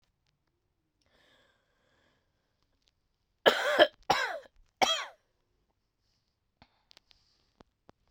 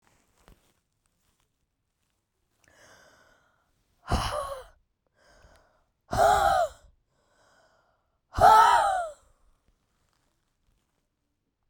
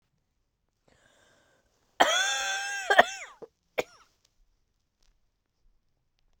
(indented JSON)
{
  "three_cough_length": "8.1 s",
  "three_cough_amplitude": 18958,
  "three_cough_signal_mean_std_ratio": 0.22,
  "exhalation_length": "11.7 s",
  "exhalation_amplitude": 18162,
  "exhalation_signal_mean_std_ratio": 0.29,
  "cough_length": "6.4 s",
  "cough_amplitude": 26090,
  "cough_signal_mean_std_ratio": 0.27,
  "survey_phase": "beta (2021-08-13 to 2022-03-07)",
  "age": "45-64",
  "gender": "Female",
  "wearing_mask": "No",
  "symptom_cough_any": true,
  "symptom_runny_or_blocked_nose": true,
  "symptom_sore_throat": true,
  "symptom_fatigue": true,
  "symptom_headache": true,
  "symptom_change_to_sense_of_smell_or_taste": true,
  "symptom_loss_of_taste": true,
  "symptom_other": true,
  "symptom_onset": "3 days",
  "smoker_status": "Current smoker (e-cigarettes or vapes only)",
  "respiratory_condition_asthma": false,
  "respiratory_condition_other": false,
  "recruitment_source": "Test and Trace",
  "submission_delay": "2 days",
  "covid_test_result": "Positive",
  "covid_test_method": "RT-qPCR"
}